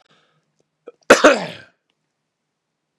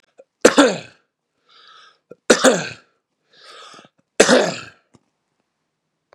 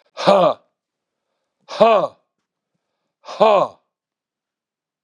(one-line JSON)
{"cough_length": "3.0 s", "cough_amplitude": 32768, "cough_signal_mean_std_ratio": 0.22, "three_cough_length": "6.1 s", "three_cough_amplitude": 32768, "three_cough_signal_mean_std_ratio": 0.29, "exhalation_length": "5.0 s", "exhalation_amplitude": 32767, "exhalation_signal_mean_std_ratio": 0.33, "survey_phase": "beta (2021-08-13 to 2022-03-07)", "age": "45-64", "gender": "Male", "wearing_mask": "No", "symptom_none": true, "symptom_onset": "2 days", "smoker_status": "Ex-smoker", "respiratory_condition_asthma": false, "respiratory_condition_other": false, "recruitment_source": "REACT", "submission_delay": "3 days", "covid_test_result": "Negative", "covid_test_method": "RT-qPCR", "influenza_a_test_result": "Negative", "influenza_b_test_result": "Negative"}